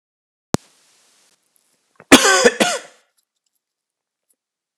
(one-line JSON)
{"cough_length": "4.8 s", "cough_amplitude": 32768, "cough_signal_mean_std_ratio": 0.25, "survey_phase": "alpha (2021-03-01 to 2021-08-12)", "age": "18-44", "gender": "Male", "wearing_mask": "No", "symptom_cough_any": true, "symptom_fatigue": true, "smoker_status": "Never smoked", "respiratory_condition_asthma": false, "respiratory_condition_other": false, "recruitment_source": "REACT", "submission_delay": "1 day", "covid_test_result": "Negative", "covid_test_method": "RT-qPCR"}